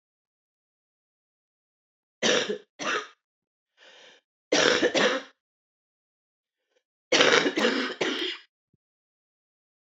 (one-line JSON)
{"three_cough_length": "10.0 s", "three_cough_amplitude": 29578, "three_cough_signal_mean_std_ratio": 0.37, "survey_phase": "beta (2021-08-13 to 2022-03-07)", "age": "45-64", "gender": "Female", "wearing_mask": "No", "symptom_cough_any": true, "symptom_new_continuous_cough": true, "symptom_runny_or_blocked_nose": true, "symptom_shortness_of_breath": true, "symptom_sore_throat": true, "symptom_fatigue": true, "symptom_fever_high_temperature": true, "symptom_headache": true, "symptom_change_to_sense_of_smell_or_taste": true, "symptom_loss_of_taste": true, "smoker_status": "Ex-smoker", "respiratory_condition_asthma": false, "respiratory_condition_other": false, "recruitment_source": "Test and Trace", "submission_delay": "1 day", "covid_test_result": "Positive", "covid_test_method": "RT-qPCR", "covid_ct_value": 16.5, "covid_ct_gene": "N gene"}